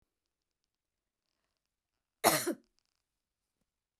{"cough_length": "4.0 s", "cough_amplitude": 12308, "cough_signal_mean_std_ratio": 0.19, "survey_phase": "beta (2021-08-13 to 2022-03-07)", "age": "45-64", "gender": "Female", "wearing_mask": "No", "symptom_none": true, "smoker_status": "Never smoked", "respiratory_condition_asthma": false, "respiratory_condition_other": false, "recruitment_source": "REACT", "submission_delay": "1 day", "covid_test_result": "Negative", "covid_test_method": "RT-qPCR", "influenza_a_test_result": "Negative", "influenza_b_test_result": "Negative"}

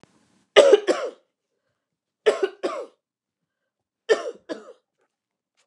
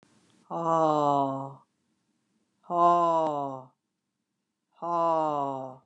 {"three_cough_length": "5.7 s", "three_cough_amplitude": 29204, "three_cough_signal_mean_std_ratio": 0.27, "exhalation_length": "5.9 s", "exhalation_amplitude": 10716, "exhalation_signal_mean_std_ratio": 0.52, "survey_phase": "alpha (2021-03-01 to 2021-08-12)", "age": "65+", "gender": "Female", "wearing_mask": "No", "symptom_none": true, "smoker_status": "Never smoked", "respiratory_condition_asthma": false, "respiratory_condition_other": false, "recruitment_source": "REACT", "submission_delay": "3 days", "covid_test_result": "Negative", "covid_test_method": "RT-qPCR"}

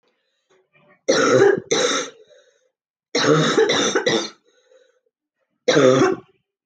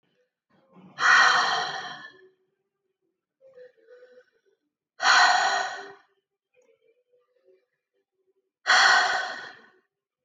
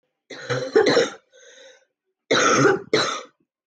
{"three_cough_length": "6.7 s", "three_cough_amplitude": 26830, "three_cough_signal_mean_std_ratio": 0.51, "exhalation_length": "10.2 s", "exhalation_amplitude": 17123, "exhalation_signal_mean_std_ratio": 0.37, "cough_length": "3.7 s", "cough_amplitude": 18090, "cough_signal_mean_std_ratio": 0.51, "survey_phase": "beta (2021-08-13 to 2022-03-07)", "age": "18-44", "gender": "Female", "wearing_mask": "No", "symptom_cough_any": true, "smoker_status": "Ex-smoker", "respiratory_condition_asthma": false, "respiratory_condition_other": false, "recruitment_source": "REACT", "submission_delay": "2 days", "covid_test_result": "Negative", "covid_test_method": "RT-qPCR", "influenza_a_test_result": "Negative", "influenza_b_test_result": "Negative"}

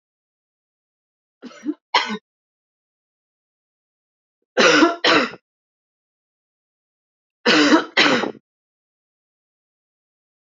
{"three_cough_length": "10.4 s", "three_cough_amplitude": 29347, "three_cough_signal_mean_std_ratio": 0.3, "survey_phase": "beta (2021-08-13 to 2022-03-07)", "age": "18-44", "gender": "Female", "wearing_mask": "No", "symptom_runny_or_blocked_nose": true, "smoker_status": "Never smoked", "respiratory_condition_asthma": false, "respiratory_condition_other": false, "recruitment_source": "Test and Trace", "submission_delay": "2 days", "covid_test_result": "Positive", "covid_test_method": "RT-qPCR", "covid_ct_value": 22.5, "covid_ct_gene": "ORF1ab gene", "covid_ct_mean": 23.0, "covid_viral_load": "29000 copies/ml", "covid_viral_load_category": "Low viral load (10K-1M copies/ml)"}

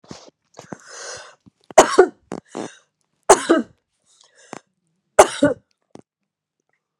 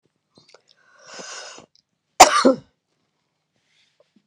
{"three_cough_length": "7.0 s", "three_cough_amplitude": 32768, "three_cough_signal_mean_std_ratio": 0.24, "cough_length": "4.3 s", "cough_amplitude": 32768, "cough_signal_mean_std_ratio": 0.21, "survey_phase": "beta (2021-08-13 to 2022-03-07)", "age": "45-64", "gender": "Female", "wearing_mask": "No", "symptom_none": true, "smoker_status": "Ex-smoker", "respiratory_condition_asthma": false, "respiratory_condition_other": false, "recruitment_source": "REACT", "submission_delay": "3 days", "covid_test_result": "Negative", "covid_test_method": "RT-qPCR"}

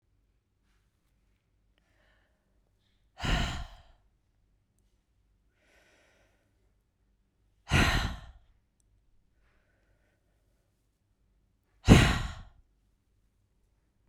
{"exhalation_length": "14.1 s", "exhalation_amplitude": 21402, "exhalation_signal_mean_std_ratio": 0.21, "survey_phase": "beta (2021-08-13 to 2022-03-07)", "age": "45-64", "gender": "Female", "wearing_mask": "No", "symptom_cough_any": true, "smoker_status": "Never smoked", "respiratory_condition_asthma": false, "respiratory_condition_other": true, "recruitment_source": "REACT", "submission_delay": "1 day", "covid_test_result": "Negative", "covid_test_method": "RT-qPCR"}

